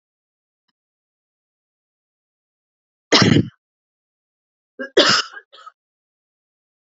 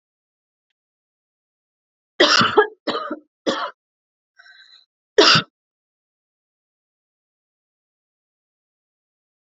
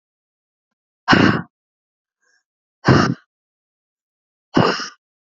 {
  "cough_length": "6.9 s",
  "cough_amplitude": 30939,
  "cough_signal_mean_std_ratio": 0.23,
  "three_cough_length": "9.6 s",
  "three_cough_amplitude": 29700,
  "three_cough_signal_mean_std_ratio": 0.24,
  "exhalation_length": "5.3 s",
  "exhalation_amplitude": 28240,
  "exhalation_signal_mean_std_ratio": 0.3,
  "survey_phase": "alpha (2021-03-01 to 2021-08-12)",
  "age": "18-44",
  "gender": "Female",
  "wearing_mask": "No",
  "symptom_headache": true,
  "symptom_onset": "5 days",
  "smoker_status": "Never smoked",
  "respiratory_condition_asthma": false,
  "respiratory_condition_other": false,
  "recruitment_source": "REACT",
  "submission_delay": "1 day",
  "covid_test_result": "Negative",
  "covid_test_method": "RT-qPCR"
}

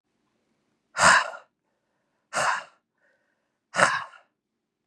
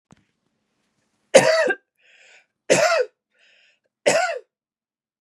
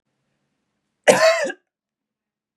{
  "exhalation_length": "4.9 s",
  "exhalation_amplitude": 27966,
  "exhalation_signal_mean_std_ratio": 0.3,
  "three_cough_length": "5.2 s",
  "three_cough_amplitude": 32505,
  "three_cough_signal_mean_std_ratio": 0.34,
  "cough_length": "2.6 s",
  "cough_amplitude": 32588,
  "cough_signal_mean_std_ratio": 0.3,
  "survey_phase": "beta (2021-08-13 to 2022-03-07)",
  "age": "45-64",
  "gender": "Female",
  "wearing_mask": "Yes",
  "symptom_runny_or_blocked_nose": true,
  "smoker_status": "Never smoked",
  "respiratory_condition_asthma": false,
  "respiratory_condition_other": false,
  "recruitment_source": "REACT",
  "submission_delay": "-1 day",
  "covid_test_result": "Negative",
  "covid_test_method": "RT-qPCR",
  "influenza_a_test_result": "Negative",
  "influenza_b_test_result": "Negative"
}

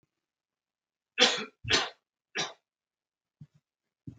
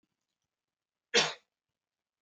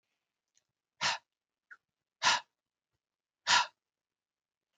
{
  "three_cough_length": "4.2 s",
  "three_cough_amplitude": 14028,
  "three_cough_signal_mean_std_ratio": 0.27,
  "cough_length": "2.2 s",
  "cough_amplitude": 9025,
  "cough_signal_mean_std_ratio": 0.21,
  "exhalation_length": "4.8 s",
  "exhalation_amplitude": 7579,
  "exhalation_signal_mean_std_ratio": 0.24,
  "survey_phase": "beta (2021-08-13 to 2022-03-07)",
  "age": "45-64",
  "gender": "Male",
  "wearing_mask": "No",
  "symptom_sore_throat": true,
  "symptom_fatigue": true,
  "smoker_status": "Ex-smoker",
  "respiratory_condition_asthma": false,
  "respiratory_condition_other": false,
  "recruitment_source": "Test and Trace",
  "submission_delay": "2 days",
  "covid_test_method": "RT-qPCR",
  "covid_ct_value": 31.8,
  "covid_ct_gene": "ORF1ab gene"
}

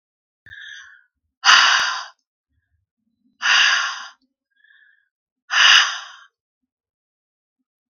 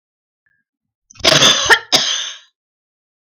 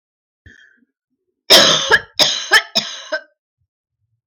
{
  "exhalation_length": "7.9 s",
  "exhalation_amplitude": 32768,
  "exhalation_signal_mean_std_ratio": 0.34,
  "cough_length": "3.3 s",
  "cough_amplitude": 32768,
  "cough_signal_mean_std_ratio": 0.39,
  "three_cough_length": "4.3 s",
  "three_cough_amplitude": 32768,
  "three_cough_signal_mean_std_ratio": 0.37,
  "survey_phase": "beta (2021-08-13 to 2022-03-07)",
  "age": "45-64",
  "gender": "Female",
  "wearing_mask": "No",
  "symptom_none": true,
  "smoker_status": "Never smoked",
  "respiratory_condition_asthma": false,
  "respiratory_condition_other": false,
  "recruitment_source": "REACT",
  "submission_delay": "5 days",
  "covid_test_result": "Negative",
  "covid_test_method": "RT-qPCR",
  "influenza_a_test_result": "Negative",
  "influenza_b_test_result": "Negative"
}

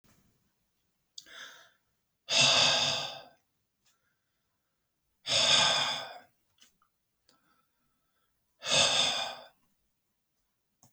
{
  "exhalation_length": "10.9 s",
  "exhalation_amplitude": 10082,
  "exhalation_signal_mean_std_ratio": 0.37,
  "survey_phase": "beta (2021-08-13 to 2022-03-07)",
  "age": "65+",
  "gender": "Male",
  "wearing_mask": "No",
  "symptom_none": true,
  "smoker_status": "Ex-smoker",
  "respiratory_condition_asthma": false,
  "respiratory_condition_other": false,
  "recruitment_source": "REACT",
  "submission_delay": "2 days",
  "covid_test_result": "Negative",
  "covid_test_method": "RT-qPCR"
}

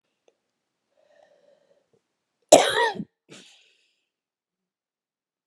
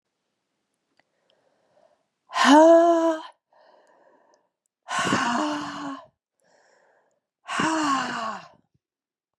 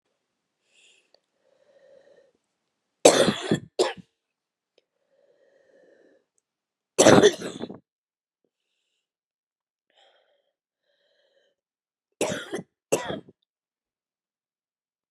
{
  "cough_length": "5.5 s",
  "cough_amplitude": 32768,
  "cough_signal_mean_std_ratio": 0.18,
  "exhalation_length": "9.4 s",
  "exhalation_amplitude": 22280,
  "exhalation_signal_mean_std_ratio": 0.38,
  "three_cough_length": "15.1 s",
  "three_cough_amplitude": 30425,
  "three_cough_signal_mean_std_ratio": 0.2,
  "survey_phase": "beta (2021-08-13 to 2022-03-07)",
  "age": "45-64",
  "gender": "Female",
  "wearing_mask": "No",
  "symptom_cough_any": true,
  "symptom_new_continuous_cough": true,
  "symptom_runny_or_blocked_nose": true,
  "symptom_sore_throat": true,
  "symptom_fatigue": true,
  "symptom_onset": "4 days",
  "smoker_status": "Ex-smoker",
  "respiratory_condition_asthma": false,
  "respiratory_condition_other": false,
  "recruitment_source": "Test and Trace",
  "submission_delay": "1 day",
  "covid_test_result": "Positive",
  "covid_test_method": "RT-qPCR",
  "covid_ct_value": 14.9,
  "covid_ct_gene": "ORF1ab gene",
  "covid_ct_mean": 15.2,
  "covid_viral_load": "10000000 copies/ml",
  "covid_viral_load_category": "High viral load (>1M copies/ml)"
}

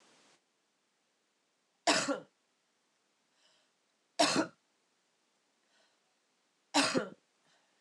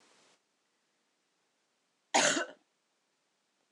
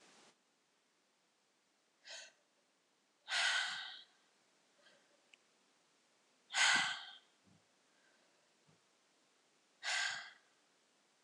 {
  "three_cough_length": "7.8 s",
  "three_cough_amplitude": 7962,
  "three_cough_signal_mean_std_ratio": 0.26,
  "cough_length": "3.7 s",
  "cough_amplitude": 7063,
  "cough_signal_mean_std_ratio": 0.23,
  "exhalation_length": "11.2 s",
  "exhalation_amplitude": 3941,
  "exhalation_signal_mean_std_ratio": 0.3,
  "survey_phase": "alpha (2021-03-01 to 2021-08-12)",
  "age": "18-44",
  "gender": "Female",
  "wearing_mask": "Yes",
  "symptom_cough_any": true,
  "symptom_fatigue": true,
  "symptom_headache": true,
  "symptom_change_to_sense_of_smell_or_taste": true,
  "smoker_status": "Never smoked",
  "respiratory_condition_asthma": false,
  "respiratory_condition_other": false,
  "recruitment_source": "Test and Trace",
  "submission_delay": "1 day",
  "covid_test_result": "Positive",
  "covid_test_method": "RT-qPCR",
  "covid_ct_value": 24.2,
  "covid_ct_gene": "ORF1ab gene",
  "covid_ct_mean": 25.7,
  "covid_viral_load": "3700 copies/ml",
  "covid_viral_load_category": "Minimal viral load (< 10K copies/ml)"
}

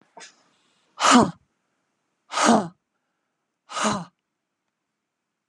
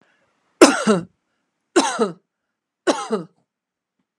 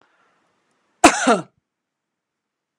{
  "exhalation_length": "5.5 s",
  "exhalation_amplitude": 28223,
  "exhalation_signal_mean_std_ratio": 0.29,
  "three_cough_length": "4.2 s",
  "three_cough_amplitude": 32768,
  "three_cough_signal_mean_std_ratio": 0.32,
  "cough_length": "2.8 s",
  "cough_amplitude": 32768,
  "cough_signal_mean_std_ratio": 0.23,
  "survey_phase": "beta (2021-08-13 to 2022-03-07)",
  "age": "45-64",
  "gender": "Female",
  "wearing_mask": "No",
  "symptom_runny_or_blocked_nose": true,
  "smoker_status": "Ex-smoker",
  "respiratory_condition_asthma": false,
  "respiratory_condition_other": false,
  "recruitment_source": "REACT",
  "submission_delay": "19 days",
  "covid_test_result": "Negative",
  "covid_test_method": "RT-qPCR"
}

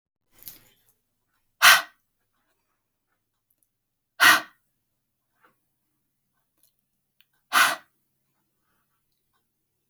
{
  "exhalation_length": "9.9 s",
  "exhalation_amplitude": 27639,
  "exhalation_signal_mean_std_ratio": 0.19,
  "survey_phase": "alpha (2021-03-01 to 2021-08-12)",
  "age": "45-64",
  "gender": "Female",
  "wearing_mask": "No",
  "symptom_none": true,
  "smoker_status": "Ex-smoker",
  "respiratory_condition_asthma": false,
  "respiratory_condition_other": false,
  "recruitment_source": "REACT",
  "submission_delay": "2 days",
  "covid_test_result": "Negative",
  "covid_test_method": "RT-qPCR"
}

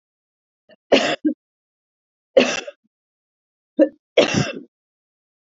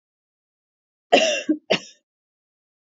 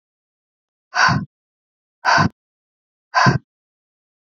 {
  "three_cough_length": "5.5 s",
  "three_cough_amplitude": 28046,
  "three_cough_signal_mean_std_ratio": 0.3,
  "cough_length": "3.0 s",
  "cough_amplitude": 28503,
  "cough_signal_mean_std_ratio": 0.29,
  "exhalation_length": "4.3 s",
  "exhalation_amplitude": 26910,
  "exhalation_signal_mean_std_ratio": 0.33,
  "survey_phase": "beta (2021-08-13 to 2022-03-07)",
  "age": "45-64",
  "gender": "Female",
  "wearing_mask": "No",
  "symptom_cough_any": true,
  "symptom_runny_or_blocked_nose": true,
  "symptom_shortness_of_breath": true,
  "symptom_fatigue": true,
  "symptom_headache": true,
  "symptom_onset": "4 days",
  "smoker_status": "Never smoked",
  "respiratory_condition_asthma": false,
  "respiratory_condition_other": false,
  "recruitment_source": "Test and Trace",
  "submission_delay": "2 days",
  "covid_test_result": "Positive",
  "covid_test_method": "RT-qPCR",
  "covid_ct_value": 16.2,
  "covid_ct_gene": "N gene",
  "covid_ct_mean": 16.4,
  "covid_viral_load": "4200000 copies/ml",
  "covid_viral_load_category": "High viral load (>1M copies/ml)"
}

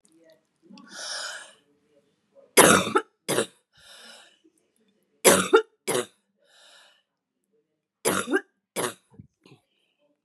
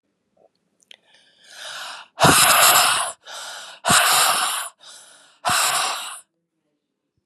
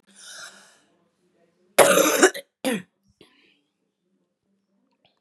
{
  "three_cough_length": "10.2 s",
  "three_cough_amplitude": 32767,
  "three_cough_signal_mean_std_ratio": 0.28,
  "exhalation_length": "7.3 s",
  "exhalation_amplitude": 31819,
  "exhalation_signal_mean_std_ratio": 0.49,
  "cough_length": "5.2 s",
  "cough_amplitude": 32767,
  "cough_signal_mean_std_ratio": 0.28,
  "survey_phase": "beta (2021-08-13 to 2022-03-07)",
  "age": "65+",
  "gender": "Female",
  "wearing_mask": "No",
  "symptom_cough_any": true,
  "symptom_fatigue": true,
  "symptom_onset": "4 days",
  "smoker_status": "Ex-smoker",
  "respiratory_condition_asthma": false,
  "respiratory_condition_other": false,
  "recruitment_source": "Test and Trace",
  "submission_delay": "1 day",
  "covid_test_result": "Positive",
  "covid_test_method": "RT-qPCR",
  "covid_ct_value": 17.6,
  "covid_ct_gene": "N gene"
}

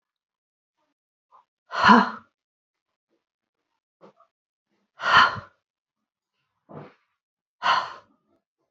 {
  "exhalation_length": "8.7 s",
  "exhalation_amplitude": 27761,
  "exhalation_signal_mean_std_ratio": 0.23,
  "survey_phase": "beta (2021-08-13 to 2022-03-07)",
  "age": "18-44",
  "gender": "Female",
  "wearing_mask": "Yes",
  "symptom_none": true,
  "smoker_status": "Never smoked",
  "respiratory_condition_asthma": false,
  "respiratory_condition_other": false,
  "recruitment_source": "REACT",
  "submission_delay": "1 day",
  "covid_test_result": "Negative",
  "covid_test_method": "RT-qPCR"
}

